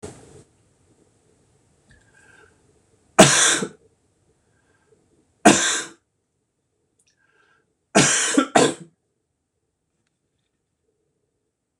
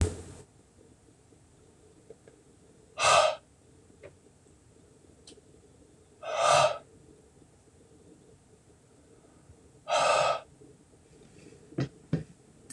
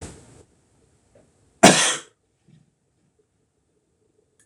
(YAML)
three_cough_length: 11.8 s
three_cough_amplitude: 26028
three_cough_signal_mean_std_ratio: 0.26
exhalation_length: 12.7 s
exhalation_amplitude: 11555
exhalation_signal_mean_std_ratio: 0.32
cough_length: 4.5 s
cough_amplitude: 26028
cough_signal_mean_std_ratio: 0.2
survey_phase: beta (2021-08-13 to 2022-03-07)
age: 45-64
gender: Male
wearing_mask: 'No'
symptom_headache: true
symptom_onset: 4 days
smoker_status: Never smoked
respiratory_condition_asthma: true
respiratory_condition_other: false
recruitment_source: REACT
submission_delay: 2 days
covid_test_result: Negative
covid_test_method: RT-qPCR
influenza_a_test_result: Negative
influenza_b_test_result: Negative